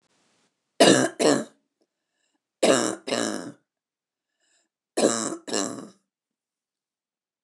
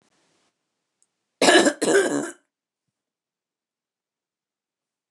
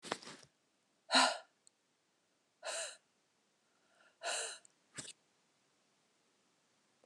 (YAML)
three_cough_length: 7.4 s
three_cough_amplitude: 26873
three_cough_signal_mean_std_ratio: 0.33
cough_length: 5.1 s
cough_amplitude: 25100
cough_signal_mean_std_ratio: 0.29
exhalation_length: 7.1 s
exhalation_amplitude: 5383
exhalation_signal_mean_std_ratio: 0.25
survey_phase: beta (2021-08-13 to 2022-03-07)
age: 45-64
gender: Female
wearing_mask: 'No'
symptom_none: true
smoker_status: Never smoked
respiratory_condition_asthma: false
respiratory_condition_other: false
recruitment_source: REACT
submission_delay: 1 day
covid_test_result: Negative
covid_test_method: RT-qPCR
influenza_a_test_result: Negative
influenza_b_test_result: Negative